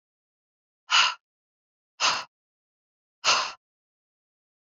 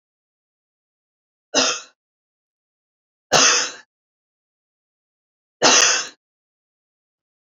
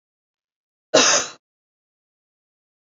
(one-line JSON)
{"exhalation_length": "4.7 s", "exhalation_amplitude": 13959, "exhalation_signal_mean_std_ratio": 0.29, "three_cough_length": "7.6 s", "three_cough_amplitude": 32768, "three_cough_signal_mean_std_ratio": 0.28, "cough_length": "3.0 s", "cough_amplitude": 29288, "cough_signal_mean_std_ratio": 0.25, "survey_phase": "beta (2021-08-13 to 2022-03-07)", "age": "18-44", "gender": "Female", "wearing_mask": "No", "symptom_cough_any": true, "symptom_new_continuous_cough": true, "symptom_shortness_of_breath": true, "symptom_fatigue": true, "symptom_onset": "6 days", "smoker_status": "Never smoked", "respiratory_condition_asthma": true, "respiratory_condition_other": false, "recruitment_source": "Test and Trace", "submission_delay": "1 day", "covid_test_result": "Positive", "covid_test_method": "RT-qPCR", "covid_ct_value": 23.9, "covid_ct_gene": "ORF1ab gene"}